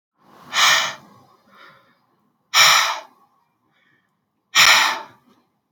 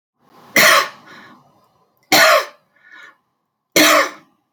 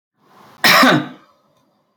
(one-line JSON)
{"exhalation_length": "5.7 s", "exhalation_amplitude": 30823, "exhalation_signal_mean_std_ratio": 0.37, "three_cough_length": "4.5 s", "three_cough_amplitude": 31015, "three_cough_signal_mean_std_ratio": 0.4, "cough_length": "2.0 s", "cough_amplitude": 31456, "cough_signal_mean_std_ratio": 0.39, "survey_phase": "alpha (2021-03-01 to 2021-08-12)", "age": "18-44", "gender": "Female", "wearing_mask": "No", "symptom_none": true, "smoker_status": "Current smoker (11 or more cigarettes per day)", "respiratory_condition_asthma": true, "respiratory_condition_other": false, "recruitment_source": "REACT", "submission_delay": "2 days", "covid_test_result": "Negative", "covid_test_method": "RT-qPCR"}